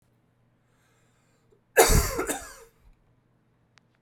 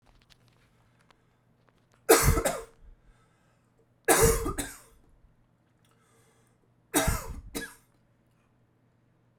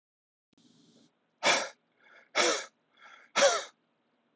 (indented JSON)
{
  "cough_length": "4.0 s",
  "cough_amplitude": 26215,
  "cough_signal_mean_std_ratio": 0.27,
  "three_cough_length": "9.4 s",
  "three_cough_amplitude": 16708,
  "three_cough_signal_mean_std_ratio": 0.3,
  "exhalation_length": "4.4 s",
  "exhalation_amplitude": 8970,
  "exhalation_signal_mean_std_ratio": 0.34,
  "survey_phase": "beta (2021-08-13 to 2022-03-07)",
  "age": "18-44",
  "gender": "Male",
  "wearing_mask": "No",
  "symptom_cough_any": true,
  "symptom_new_continuous_cough": true,
  "symptom_runny_or_blocked_nose": true,
  "symptom_shortness_of_breath": true,
  "symptom_sore_throat": true,
  "symptom_fatigue": true,
  "symptom_fever_high_temperature": true,
  "symptom_headache": true,
  "symptom_change_to_sense_of_smell_or_taste": true,
  "symptom_loss_of_taste": true,
  "smoker_status": "Ex-smoker",
  "respiratory_condition_asthma": false,
  "respiratory_condition_other": false,
  "recruitment_source": "Test and Trace",
  "submission_delay": "2 days",
  "covid_test_result": "Positive",
  "covid_test_method": "RT-qPCR",
  "covid_ct_value": 13.3,
  "covid_ct_gene": "ORF1ab gene",
  "covid_ct_mean": 14.0,
  "covid_viral_load": "26000000 copies/ml",
  "covid_viral_load_category": "High viral load (>1M copies/ml)"
}